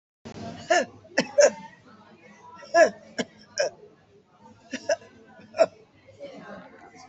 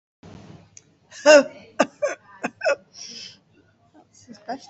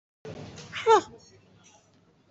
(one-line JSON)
{"three_cough_length": "7.1 s", "three_cough_amplitude": 16836, "three_cough_signal_mean_std_ratio": 0.32, "cough_length": "4.7 s", "cough_amplitude": 28343, "cough_signal_mean_std_ratio": 0.28, "exhalation_length": "2.3 s", "exhalation_amplitude": 13470, "exhalation_signal_mean_std_ratio": 0.27, "survey_phase": "alpha (2021-03-01 to 2021-08-12)", "age": "65+", "gender": "Female", "wearing_mask": "No", "symptom_none": true, "smoker_status": "Never smoked", "respiratory_condition_asthma": false, "respiratory_condition_other": false, "recruitment_source": "REACT", "submission_delay": "3 days", "covid_test_result": "Negative", "covid_test_method": "RT-qPCR"}